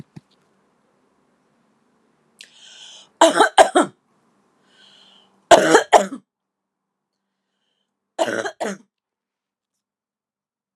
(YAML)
three_cough_length: 10.8 s
three_cough_amplitude: 32768
three_cough_signal_mean_std_ratio: 0.24
survey_phase: alpha (2021-03-01 to 2021-08-12)
age: 18-44
gender: Female
wearing_mask: 'No'
symptom_fatigue: true
symptom_headache: true
symptom_onset: 12 days
smoker_status: Ex-smoker
respiratory_condition_asthma: false
respiratory_condition_other: false
recruitment_source: REACT
submission_delay: 1 day
covid_test_result: Negative
covid_test_method: RT-qPCR